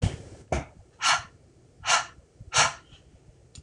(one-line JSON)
{"exhalation_length": "3.6 s", "exhalation_amplitude": 12706, "exhalation_signal_mean_std_ratio": 0.4, "survey_phase": "beta (2021-08-13 to 2022-03-07)", "age": "18-44", "gender": "Female", "wearing_mask": "No", "symptom_new_continuous_cough": true, "symptom_runny_or_blocked_nose": true, "symptom_fatigue": true, "smoker_status": "Never smoked", "respiratory_condition_asthma": false, "respiratory_condition_other": false, "recruitment_source": "Test and Trace", "submission_delay": "2 days", "covid_test_result": "Positive", "covid_test_method": "ePCR"}